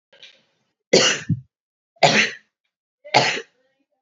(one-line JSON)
{"three_cough_length": "4.0 s", "three_cough_amplitude": 29067, "three_cough_signal_mean_std_ratio": 0.36, "survey_phase": "beta (2021-08-13 to 2022-03-07)", "age": "45-64", "gender": "Female", "wearing_mask": "No", "symptom_none": true, "symptom_onset": "11 days", "smoker_status": "Never smoked", "respiratory_condition_asthma": false, "respiratory_condition_other": false, "recruitment_source": "REACT", "submission_delay": "3 days", "covid_test_result": "Negative", "covid_test_method": "RT-qPCR", "influenza_a_test_result": "Negative", "influenza_b_test_result": "Negative"}